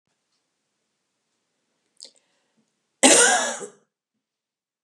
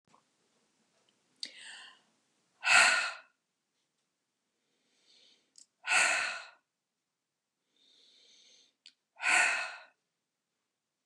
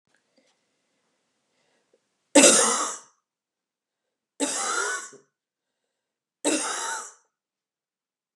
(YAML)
cough_length: 4.8 s
cough_amplitude: 32512
cough_signal_mean_std_ratio: 0.25
exhalation_length: 11.1 s
exhalation_amplitude: 11027
exhalation_signal_mean_std_ratio: 0.28
three_cough_length: 8.4 s
three_cough_amplitude: 28655
three_cough_signal_mean_std_ratio: 0.3
survey_phase: beta (2021-08-13 to 2022-03-07)
age: 65+
gender: Female
wearing_mask: 'No'
symptom_none: true
smoker_status: Never smoked
respiratory_condition_asthma: false
respiratory_condition_other: false
recruitment_source: REACT
submission_delay: 1 day
covid_test_result: Negative
covid_test_method: RT-qPCR
influenza_a_test_result: Negative
influenza_b_test_result: Negative